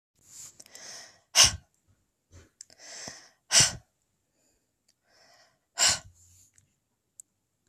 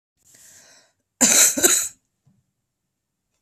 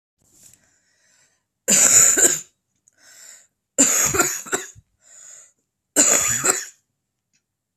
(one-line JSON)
{"exhalation_length": "7.7 s", "exhalation_amplitude": 21662, "exhalation_signal_mean_std_ratio": 0.23, "cough_length": "3.4 s", "cough_amplitude": 32198, "cough_signal_mean_std_ratio": 0.33, "three_cough_length": "7.8 s", "three_cough_amplitude": 32768, "three_cough_signal_mean_std_ratio": 0.4, "survey_phase": "beta (2021-08-13 to 2022-03-07)", "age": "18-44", "gender": "Female", "wearing_mask": "No", "symptom_sore_throat": true, "symptom_diarrhoea": true, "symptom_fatigue": true, "symptom_fever_high_temperature": true, "symptom_headache": true, "symptom_other": true, "symptom_onset": "3 days", "smoker_status": "Current smoker (1 to 10 cigarettes per day)", "respiratory_condition_asthma": false, "respiratory_condition_other": false, "recruitment_source": "Test and Trace", "submission_delay": "1 day", "covid_test_result": "Positive", "covid_test_method": "RT-qPCR", "covid_ct_value": 12.8, "covid_ct_gene": "ORF1ab gene"}